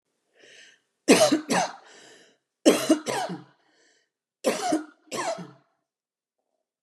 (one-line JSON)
{"three_cough_length": "6.8 s", "three_cough_amplitude": 25796, "three_cough_signal_mean_std_ratio": 0.36, "survey_phase": "beta (2021-08-13 to 2022-03-07)", "age": "45-64", "gender": "Female", "wearing_mask": "No", "symptom_none": true, "smoker_status": "Never smoked", "respiratory_condition_asthma": false, "respiratory_condition_other": false, "recruitment_source": "REACT", "submission_delay": "1 day", "covid_test_result": "Negative", "covid_test_method": "RT-qPCR", "influenza_a_test_result": "Negative", "influenza_b_test_result": "Negative"}